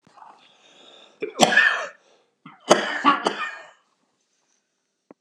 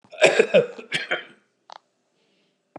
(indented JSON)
{
  "three_cough_length": "5.2 s",
  "three_cough_amplitude": 32768,
  "three_cough_signal_mean_std_ratio": 0.35,
  "cough_length": "2.8 s",
  "cough_amplitude": 31497,
  "cough_signal_mean_std_ratio": 0.34,
  "survey_phase": "beta (2021-08-13 to 2022-03-07)",
  "age": "65+",
  "gender": "Male",
  "wearing_mask": "No",
  "symptom_cough_any": true,
  "symptom_shortness_of_breath": true,
  "symptom_abdominal_pain": true,
  "symptom_fatigue": true,
  "symptom_headache": true,
  "symptom_onset": "12 days",
  "smoker_status": "Ex-smoker",
  "respiratory_condition_asthma": false,
  "respiratory_condition_other": true,
  "recruitment_source": "REACT",
  "submission_delay": "3 days",
  "covid_test_result": "Negative",
  "covid_test_method": "RT-qPCR",
  "influenza_a_test_result": "Negative",
  "influenza_b_test_result": "Negative"
}